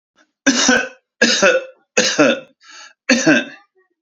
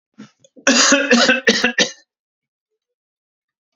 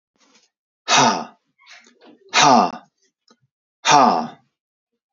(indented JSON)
{
  "three_cough_length": "4.0 s",
  "three_cough_amplitude": 31900,
  "three_cough_signal_mean_std_ratio": 0.53,
  "cough_length": "3.8 s",
  "cough_amplitude": 32759,
  "cough_signal_mean_std_ratio": 0.43,
  "exhalation_length": "5.1 s",
  "exhalation_amplitude": 32768,
  "exhalation_signal_mean_std_ratio": 0.37,
  "survey_phase": "alpha (2021-03-01 to 2021-08-12)",
  "age": "45-64",
  "gender": "Male",
  "wearing_mask": "No",
  "symptom_none": true,
  "smoker_status": "Never smoked",
  "respiratory_condition_asthma": false,
  "respiratory_condition_other": false,
  "recruitment_source": "REACT",
  "submission_delay": "1 day",
  "covid_test_result": "Negative",
  "covid_test_method": "RT-qPCR"
}